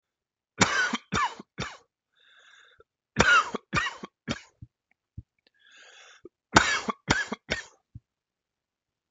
three_cough_length: 9.1 s
three_cough_amplitude: 26028
three_cough_signal_mean_std_ratio: 0.33
survey_phase: beta (2021-08-13 to 2022-03-07)
age: 45-64
gender: Male
wearing_mask: 'No'
symptom_cough_any: true
symptom_runny_or_blocked_nose: true
symptom_fatigue: true
symptom_headache: true
symptom_onset: 4 days
smoker_status: Never smoked
respiratory_condition_asthma: false
respiratory_condition_other: false
recruitment_source: Test and Trace
submission_delay: 1 day
covid_test_result: Negative
covid_test_method: RT-qPCR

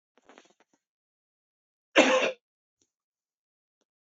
cough_length: 4.1 s
cough_amplitude: 17374
cough_signal_mean_std_ratio: 0.22
survey_phase: beta (2021-08-13 to 2022-03-07)
age: 45-64
gender: Male
wearing_mask: 'No'
symptom_none: true
smoker_status: Never smoked
respiratory_condition_asthma: false
respiratory_condition_other: false
recruitment_source: REACT
submission_delay: 1 day
covid_test_result: Negative
covid_test_method: RT-qPCR
influenza_a_test_result: Negative
influenza_b_test_result: Negative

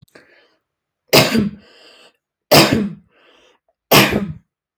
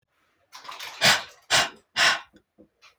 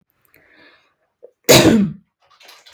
three_cough_length: 4.8 s
three_cough_amplitude: 32768
three_cough_signal_mean_std_ratio: 0.37
exhalation_length: 3.0 s
exhalation_amplitude: 17894
exhalation_signal_mean_std_ratio: 0.38
cough_length: 2.7 s
cough_amplitude: 32768
cough_signal_mean_std_ratio: 0.33
survey_phase: alpha (2021-03-01 to 2021-08-12)
age: 18-44
gender: Female
wearing_mask: 'No'
symptom_none: true
smoker_status: Never smoked
respiratory_condition_asthma: false
respiratory_condition_other: false
recruitment_source: REACT
submission_delay: 2 days
covid_test_result: Negative
covid_test_method: RT-qPCR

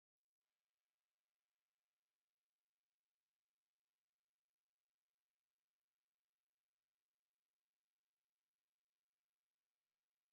exhalation_length: 10.3 s
exhalation_amplitude: 3
exhalation_signal_mean_std_ratio: 0.2
survey_phase: beta (2021-08-13 to 2022-03-07)
age: 45-64
gender: Male
wearing_mask: 'No'
symptom_sore_throat: true
symptom_headache: true
symptom_onset: 13 days
smoker_status: Ex-smoker
respiratory_condition_asthma: false
respiratory_condition_other: true
recruitment_source: REACT
submission_delay: 2 days
covid_test_result: Negative
covid_test_method: RT-qPCR
influenza_a_test_result: Negative
influenza_b_test_result: Negative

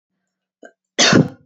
three_cough_length: 1.5 s
three_cough_amplitude: 28680
three_cough_signal_mean_std_ratio: 0.36
survey_phase: beta (2021-08-13 to 2022-03-07)
age: 45-64
gender: Female
wearing_mask: 'No'
symptom_runny_or_blocked_nose: true
symptom_fatigue: true
symptom_headache: true
symptom_other: true
smoker_status: Never smoked
respiratory_condition_asthma: false
respiratory_condition_other: false
recruitment_source: Test and Trace
submission_delay: 0 days
covid_test_result: Negative
covid_test_method: RT-qPCR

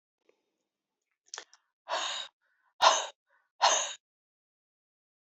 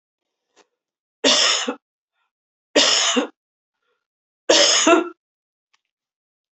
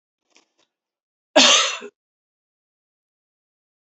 exhalation_length: 5.2 s
exhalation_amplitude: 14961
exhalation_signal_mean_std_ratio: 0.28
three_cough_length: 6.6 s
three_cough_amplitude: 30918
three_cough_signal_mean_std_ratio: 0.39
cough_length: 3.8 s
cough_amplitude: 28036
cough_signal_mean_std_ratio: 0.24
survey_phase: beta (2021-08-13 to 2022-03-07)
age: 45-64
gender: Female
wearing_mask: 'No'
symptom_cough_any: true
symptom_new_continuous_cough: true
symptom_runny_or_blocked_nose: true
symptom_sore_throat: true
symptom_diarrhoea: true
symptom_fatigue: true
symptom_headache: true
symptom_onset: 2 days
smoker_status: Never smoked
respiratory_condition_asthma: false
respiratory_condition_other: false
recruitment_source: Test and Trace
submission_delay: 1 day
covid_test_result: Positive
covid_test_method: RT-qPCR
covid_ct_value: 18.5
covid_ct_gene: ORF1ab gene
covid_ct_mean: 18.9
covid_viral_load: 620000 copies/ml
covid_viral_load_category: Low viral load (10K-1M copies/ml)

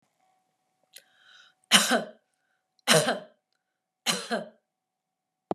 three_cough_length: 5.5 s
three_cough_amplitude: 25391
three_cough_signal_mean_std_ratio: 0.29
survey_phase: beta (2021-08-13 to 2022-03-07)
age: 18-44
gender: Male
wearing_mask: 'No'
symptom_runny_or_blocked_nose: true
symptom_fatigue: true
symptom_other: true
smoker_status: Never smoked
respiratory_condition_asthma: false
respiratory_condition_other: false
recruitment_source: Test and Trace
submission_delay: 3 days
covid_test_result: Positive
covid_test_method: RT-qPCR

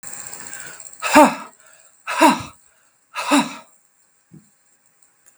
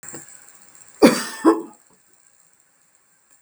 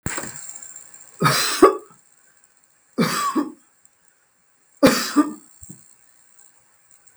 exhalation_length: 5.4 s
exhalation_amplitude: 32768
exhalation_signal_mean_std_ratio: 0.33
cough_length: 3.4 s
cough_amplitude: 32768
cough_signal_mean_std_ratio: 0.27
three_cough_length: 7.2 s
three_cough_amplitude: 32768
three_cough_signal_mean_std_ratio: 0.36
survey_phase: beta (2021-08-13 to 2022-03-07)
age: 65+
gender: Female
wearing_mask: 'No'
symptom_none: true
smoker_status: Never smoked
respiratory_condition_asthma: true
respiratory_condition_other: false
recruitment_source: REACT
submission_delay: 1 day
covid_test_result: Negative
covid_test_method: RT-qPCR
influenza_a_test_result: Unknown/Void
influenza_b_test_result: Unknown/Void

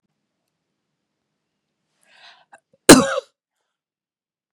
cough_length: 4.5 s
cough_amplitude: 32768
cough_signal_mean_std_ratio: 0.16
survey_phase: beta (2021-08-13 to 2022-03-07)
age: 18-44
gender: Female
wearing_mask: 'No'
symptom_cough_any: true
symptom_headache: true
smoker_status: Ex-smoker
respiratory_condition_asthma: false
respiratory_condition_other: false
recruitment_source: REACT
submission_delay: 0 days
covid_test_result: Negative
covid_test_method: RT-qPCR
influenza_a_test_result: Negative
influenza_b_test_result: Negative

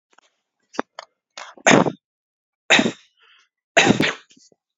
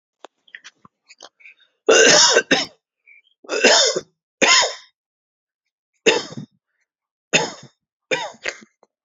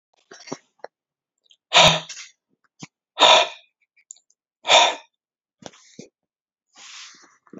three_cough_length: 4.8 s
three_cough_amplitude: 31169
three_cough_signal_mean_std_ratio: 0.31
cough_length: 9.0 s
cough_amplitude: 31856
cough_signal_mean_std_ratio: 0.37
exhalation_length: 7.6 s
exhalation_amplitude: 32767
exhalation_signal_mean_std_ratio: 0.27
survey_phase: alpha (2021-03-01 to 2021-08-12)
age: 18-44
gender: Male
wearing_mask: 'No'
symptom_none: true
smoker_status: Ex-smoker
respiratory_condition_asthma: false
respiratory_condition_other: false
recruitment_source: REACT
submission_delay: 4 days
covid_test_result: Negative
covid_test_method: RT-qPCR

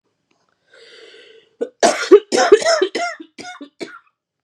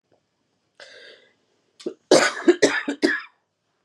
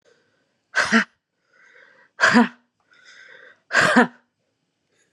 three_cough_length: 4.4 s
three_cough_amplitude: 32768
three_cough_signal_mean_std_ratio: 0.35
cough_length: 3.8 s
cough_amplitude: 27587
cough_signal_mean_std_ratio: 0.33
exhalation_length: 5.1 s
exhalation_amplitude: 29836
exhalation_signal_mean_std_ratio: 0.33
survey_phase: beta (2021-08-13 to 2022-03-07)
age: 18-44
gender: Female
wearing_mask: 'No'
symptom_cough_any: true
symptom_runny_or_blocked_nose: true
symptom_shortness_of_breath: true
symptom_fatigue: true
symptom_fever_high_temperature: true
symptom_headache: true
symptom_change_to_sense_of_smell_or_taste: true
symptom_loss_of_taste: true
symptom_onset: 3 days
smoker_status: Ex-smoker
respiratory_condition_asthma: false
respiratory_condition_other: false
recruitment_source: Test and Trace
submission_delay: 1 day
covid_test_result: Positive
covid_test_method: RT-qPCR
covid_ct_value: 15.7
covid_ct_gene: ORF1ab gene
covid_ct_mean: 16.1
covid_viral_load: 5100000 copies/ml
covid_viral_load_category: High viral load (>1M copies/ml)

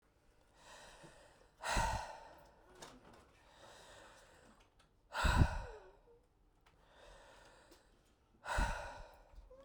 exhalation_length: 9.6 s
exhalation_amplitude: 4846
exhalation_signal_mean_std_ratio: 0.34
survey_phase: beta (2021-08-13 to 2022-03-07)
age: 18-44
gender: Female
wearing_mask: 'No'
symptom_cough_any: true
symptom_runny_or_blocked_nose: true
symptom_sore_throat: true
symptom_abdominal_pain: true
symptom_fatigue: true
symptom_fever_high_temperature: true
symptom_headache: true
symptom_change_to_sense_of_smell_or_taste: true
symptom_loss_of_taste: true
symptom_other: true
symptom_onset: 2 days
smoker_status: Current smoker (11 or more cigarettes per day)
respiratory_condition_asthma: false
respiratory_condition_other: false
recruitment_source: Test and Trace
submission_delay: 2 days
covid_test_result: Positive
covid_test_method: RT-qPCR
covid_ct_value: 23.0
covid_ct_gene: ORF1ab gene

